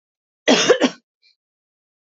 {"cough_length": "2.0 s", "cough_amplitude": 26863, "cough_signal_mean_std_ratio": 0.33, "survey_phase": "beta (2021-08-13 to 2022-03-07)", "age": "18-44", "gender": "Female", "wearing_mask": "No", "symptom_none": true, "smoker_status": "Never smoked", "respiratory_condition_asthma": false, "respiratory_condition_other": false, "recruitment_source": "REACT", "submission_delay": "2 days", "covid_test_result": "Negative", "covid_test_method": "RT-qPCR", "influenza_a_test_result": "Negative", "influenza_b_test_result": "Negative"}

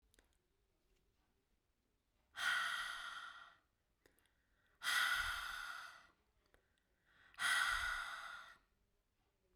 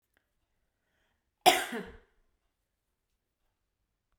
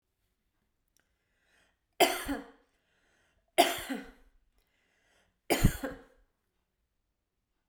{"exhalation_length": "9.6 s", "exhalation_amplitude": 1840, "exhalation_signal_mean_std_ratio": 0.44, "cough_length": "4.2 s", "cough_amplitude": 15748, "cough_signal_mean_std_ratio": 0.17, "three_cough_length": "7.7 s", "three_cough_amplitude": 14149, "three_cough_signal_mean_std_ratio": 0.24, "survey_phase": "beta (2021-08-13 to 2022-03-07)", "age": "45-64", "gender": "Female", "wearing_mask": "No", "symptom_none": true, "smoker_status": "Never smoked", "respiratory_condition_asthma": false, "respiratory_condition_other": false, "recruitment_source": "REACT", "submission_delay": "6 days", "covid_test_result": "Negative", "covid_test_method": "RT-qPCR", "covid_ct_value": 40.0, "covid_ct_gene": "N gene"}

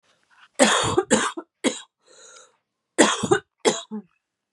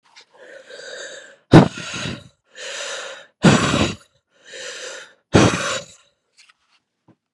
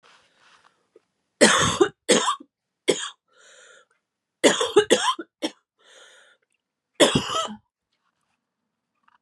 {"cough_length": "4.5 s", "cough_amplitude": 29016, "cough_signal_mean_std_ratio": 0.41, "exhalation_length": "7.3 s", "exhalation_amplitude": 32768, "exhalation_signal_mean_std_ratio": 0.34, "three_cough_length": "9.2 s", "three_cough_amplitude": 31418, "three_cough_signal_mean_std_ratio": 0.33, "survey_phase": "beta (2021-08-13 to 2022-03-07)", "age": "18-44", "gender": "Female", "wearing_mask": "No", "symptom_cough_any": true, "symptom_new_continuous_cough": true, "symptom_runny_or_blocked_nose": true, "symptom_sore_throat": true, "symptom_fatigue": true, "symptom_headache": true, "symptom_change_to_sense_of_smell_or_taste": true, "symptom_other": true, "symptom_onset": "4 days", "smoker_status": "Ex-smoker", "respiratory_condition_asthma": false, "respiratory_condition_other": false, "recruitment_source": "Test and Trace", "submission_delay": "2 days", "covid_test_result": "Positive", "covid_test_method": "RT-qPCR", "covid_ct_value": 19.5, "covid_ct_gene": "ORF1ab gene", "covid_ct_mean": 19.8, "covid_viral_load": "330000 copies/ml", "covid_viral_load_category": "Low viral load (10K-1M copies/ml)"}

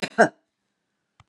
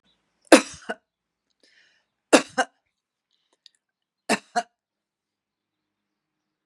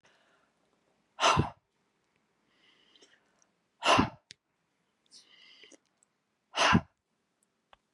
{"cough_length": "1.3 s", "cough_amplitude": 28109, "cough_signal_mean_std_ratio": 0.22, "three_cough_length": "6.7 s", "three_cough_amplitude": 32768, "three_cough_signal_mean_std_ratio": 0.16, "exhalation_length": "7.9 s", "exhalation_amplitude": 10324, "exhalation_signal_mean_std_ratio": 0.25, "survey_phase": "beta (2021-08-13 to 2022-03-07)", "age": "65+", "gender": "Female", "wearing_mask": "No", "symptom_none": true, "symptom_onset": "3 days", "smoker_status": "Ex-smoker", "respiratory_condition_asthma": false, "respiratory_condition_other": false, "recruitment_source": "REACT", "submission_delay": "4 days", "covid_test_result": "Negative", "covid_test_method": "RT-qPCR", "influenza_a_test_result": "Negative", "influenza_b_test_result": "Negative"}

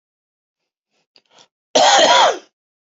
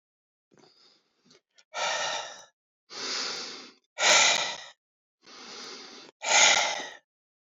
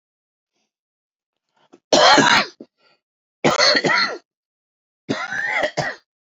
{"cough_length": "3.0 s", "cough_amplitude": 30638, "cough_signal_mean_std_ratio": 0.39, "exhalation_length": "7.4 s", "exhalation_amplitude": 18634, "exhalation_signal_mean_std_ratio": 0.41, "three_cough_length": "6.3 s", "three_cough_amplitude": 28139, "three_cough_signal_mean_std_ratio": 0.42, "survey_phase": "beta (2021-08-13 to 2022-03-07)", "age": "45-64", "gender": "Male", "wearing_mask": "No", "symptom_fatigue": true, "smoker_status": "Ex-smoker", "respiratory_condition_asthma": false, "respiratory_condition_other": true, "recruitment_source": "REACT", "submission_delay": "9 days", "covid_test_result": "Negative", "covid_test_method": "RT-qPCR"}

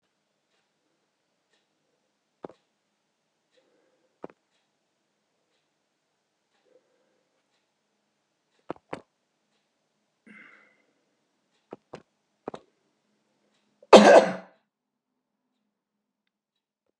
{"cough_length": "17.0 s", "cough_amplitude": 32768, "cough_signal_mean_std_ratio": 0.12, "survey_phase": "beta (2021-08-13 to 2022-03-07)", "age": "65+", "gender": "Male", "wearing_mask": "No", "symptom_none": true, "smoker_status": "Ex-smoker", "respiratory_condition_asthma": false, "respiratory_condition_other": true, "recruitment_source": "REACT", "submission_delay": "4 days", "covid_test_result": "Negative", "covid_test_method": "RT-qPCR", "influenza_a_test_result": "Negative", "influenza_b_test_result": "Negative"}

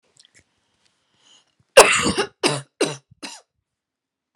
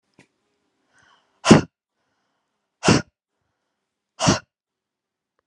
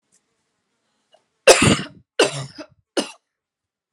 {"cough_length": "4.4 s", "cough_amplitude": 32768, "cough_signal_mean_std_ratio": 0.26, "exhalation_length": "5.5 s", "exhalation_amplitude": 32768, "exhalation_signal_mean_std_ratio": 0.21, "three_cough_length": "3.9 s", "three_cough_amplitude": 32768, "three_cough_signal_mean_std_ratio": 0.28, "survey_phase": "alpha (2021-03-01 to 2021-08-12)", "age": "18-44", "gender": "Female", "wearing_mask": "No", "symptom_new_continuous_cough": true, "symptom_shortness_of_breath": true, "symptom_fatigue": true, "symptom_headache": true, "symptom_onset": "10 days", "smoker_status": "Never smoked", "respiratory_condition_asthma": true, "respiratory_condition_other": false, "recruitment_source": "REACT", "submission_delay": "2 days", "covid_test_result": "Negative", "covid_test_method": "RT-qPCR"}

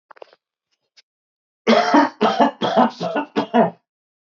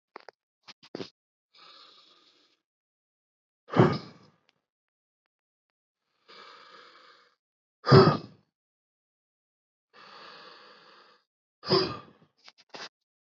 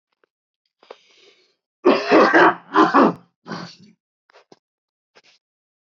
{"three_cough_length": "4.3 s", "three_cough_amplitude": 26227, "three_cough_signal_mean_std_ratio": 0.46, "exhalation_length": "13.2 s", "exhalation_amplitude": 20214, "exhalation_signal_mean_std_ratio": 0.19, "cough_length": "5.8 s", "cough_amplitude": 25640, "cough_signal_mean_std_ratio": 0.34, "survey_phase": "beta (2021-08-13 to 2022-03-07)", "age": "18-44", "gender": "Male", "wearing_mask": "No", "symptom_cough_any": true, "symptom_new_continuous_cough": true, "symptom_runny_or_blocked_nose": true, "symptom_shortness_of_breath": true, "symptom_sore_throat": true, "symptom_fatigue": true, "symptom_headache": true, "symptom_change_to_sense_of_smell_or_taste": true, "symptom_onset": "2 days", "smoker_status": "Never smoked", "respiratory_condition_asthma": true, "respiratory_condition_other": false, "recruitment_source": "Test and Trace", "submission_delay": "2 days", "covid_test_result": "Positive", "covid_test_method": "RT-qPCR", "covid_ct_value": 16.7, "covid_ct_gene": "ORF1ab gene"}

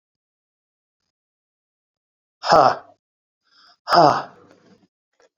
{"exhalation_length": "5.4 s", "exhalation_amplitude": 31741, "exhalation_signal_mean_std_ratio": 0.25, "survey_phase": "beta (2021-08-13 to 2022-03-07)", "age": "45-64", "gender": "Male", "wearing_mask": "No", "symptom_cough_any": true, "symptom_fatigue": true, "smoker_status": "Never smoked", "respiratory_condition_asthma": false, "respiratory_condition_other": false, "recruitment_source": "Test and Trace", "submission_delay": "1 day", "covid_test_result": "Positive", "covid_test_method": "RT-qPCR"}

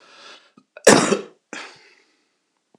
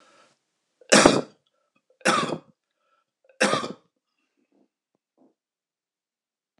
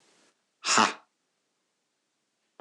{"cough_length": "2.8 s", "cough_amplitude": 26028, "cough_signal_mean_std_ratio": 0.26, "three_cough_length": "6.6 s", "three_cough_amplitude": 26028, "three_cough_signal_mean_std_ratio": 0.25, "exhalation_length": "2.6 s", "exhalation_amplitude": 17330, "exhalation_signal_mean_std_ratio": 0.24, "survey_phase": "beta (2021-08-13 to 2022-03-07)", "age": "45-64", "gender": "Male", "wearing_mask": "No", "symptom_cough_any": true, "symptom_runny_or_blocked_nose": true, "symptom_onset": "3 days", "smoker_status": "Never smoked", "respiratory_condition_asthma": false, "respiratory_condition_other": false, "recruitment_source": "Test and Trace", "submission_delay": "1 day", "covid_test_result": "Positive", "covid_test_method": "RT-qPCR", "covid_ct_value": 18.6, "covid_ct_gene": "N gene", "covid_ct_mean": 18.8, "covid_viral_load": "710000 copies/ml", "covid_viral_load_category": "Low viral load (10K-1M copies/ml)"}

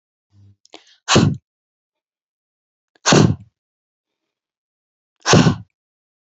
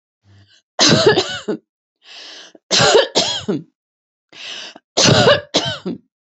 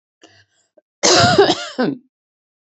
{"exhalation_length": "6.4 s", "exhalation_amplitude": 32767, "exhalation_signal_mean_std_ratio": 0.28, "three_cough_length": "6.4 s", "three_cough_amplitude": 32767, "three_cough_signal_mean_std_ratio": 0.47, "cough_length": "2.7 s", "cough_amplitude": 32767, "cough_signal_mean_std_ratio": 0.42, "survey_phase": "beta (2021-08-13 to 2022-03-07)", "age": "65+", "gender": "Female", "wearing_mask": "No", "symptom_none": true, "smoker_status": "Ex-smoker", "respiratory_condition_asthma": false, "respiratory_condition_other": false, "recruitment_source": "REACT", "submission_delay": "2 days", "covid_test_result": "Negative", "covid_test_method": "RT-qPCR", "influenza_a_test_result": "Negative", "influenza_b_test_result": "Negative"}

